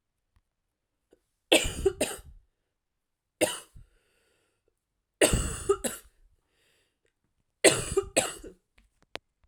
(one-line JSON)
{"three_cough_length": "9.5 s", "three_cough_amplitude": 22765, "three_cough_signal_mean_std_ratio": 0.29, "survey_phase": "alpha (2021-03-01 to 2021-08-12)", "age": "18-44", "gender": "Female", "wearing_mask": "No", "symptom_cough_any": true, "symptom_fatigue": true, "symptom_onset": "3 days", "smoker_status": "Current smoker (e-cigarettes or vapes only)", "respiratory_condition_asthma": true, "respiratory_condition_other": false, "recruitment_source": "Test and Trace", "submission_delay": "2 days", "covid_test_result": "Positive", "covid_test_method": "RT-qPCR", "covid_ct_value": 16.4, "covid_ct_gene": "ORF1ab gene", "covid_ct_mean": 17.0, "covid_viral_load": "2800000 copies/ml", "covid_viral_load_category": "High viral load (>1M copies/ml)"}